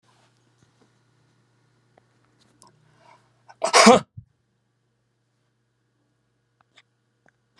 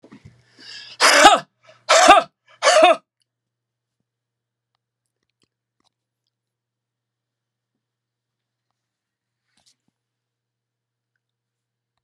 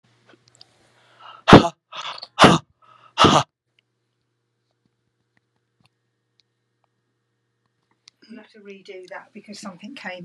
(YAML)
cough_length: 7.6 s
cough_amplitude: 32742
cough_signal_mean_std_ratio: 0.16
three_cough_length: 12.0 s
three_cough_amplitude: 32768
three_cough_signal_mean_std_ratio: 0.24
exhalation_length: 10.2 s
exhalation_amplitude: 32768
exhalation_signal_mean_std_ratio: 0.2
survey_phase: beta (2021-08-13 to 2022-03-07)
age: 65+
gender: Male
wearing_mask: 'No'
symptom_none: true
smoker_status: Never smoked
respiratory_condition_asthma: false
respiratory_condition_other: false
recruitment_source: REACT
submission_delay: 2 days
covid_test_result: Negative
covid_test_method: RT-qPCR
influenza_a_test_result: Negative
influenza_b_test_result: Negative